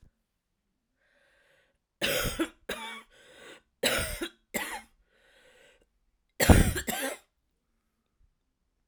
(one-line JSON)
{"three_cough_length": "8.9 s", "three_cough_amplitude": 20678, "three_cough_signal_mean_std_ratio": 0.29, "survey_phase": "alpha (2021-03-01 to 2021-08-12)", "age": "45-64", "gender": "Female", "wearing_mask": "No", "symptom_cough_any": true, "symptom_fatigue": true, "symptom_onset": "3 days", "smoker_status": "Never smoked", "respiratory_condition_asthma": false, "respiratory_condition_other": false, "recruitment_source": "Test and Trace", "submission_delay": "2 days", "covid_test_result": "Positive", "covid_test_method": "RT-qPCR"}